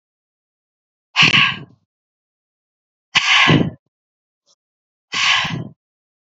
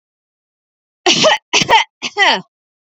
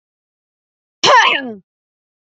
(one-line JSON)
{"exhalation_length": "6.3 s", "exhalation_amplitude": 31320, "exhalation_signal_mean_std_ratio": 0.37, "three_cough_length": "3.0 s", "three_cough_amplitude": 31610, "three_cough_signal_mean_std_ratio": 0.44, "cough_length": "2.2 s", "cough_amplitude": 29657, "cough_signal_mean_std_ratio": 0.35, "survey_phase": "beta (2021-08-13 to 2022-03-07)", "age": "18-44", "gender": "Female", "wearing_mask": "No", "symptom_sore_throat": true, "symptom_other": true, "symptom_onset": "5 days", "smoker_status": "Never smoked", "respiratory_condition_asthma": false, "respiratory_condition_other": false, "recruitment_source": "REACT", "submission_delay": "0 days", "covid_test_result": "Positive", "covid_test_method": "RT-qPCR", "covid_ct_value": 17.0, "covid_ct_gene": "E gene", "influenza_a_test_result": "Negative", "influenza_b_test_result": "Negative"}